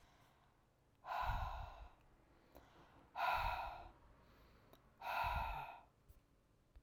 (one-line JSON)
{"exhalation_length": "6.8 s", "exhalation_amplitude": 1406, "exhalation_signal_mean_std_ratio": 0.51, "survey_phase": "beta (2021-08-13 to 2022-03-07)", "age": "45-64", "gender": "Female", "wearing_mask": "No", "symptom_cough_any": true, "symptom_runny_or_blocked_nose": true, "symptom_sore_throat": true, "symptom_fatigue": true, "symptom_headache": true, "smoker_status": "Never smoked", "respiratory_condition_asthma": false, "respiratory_condition_other": false, "recruitment_source": "Test and Trace", "submission_delay": "1 day", "covid_test_result": "Positive", "covid_test_method": "LFT"}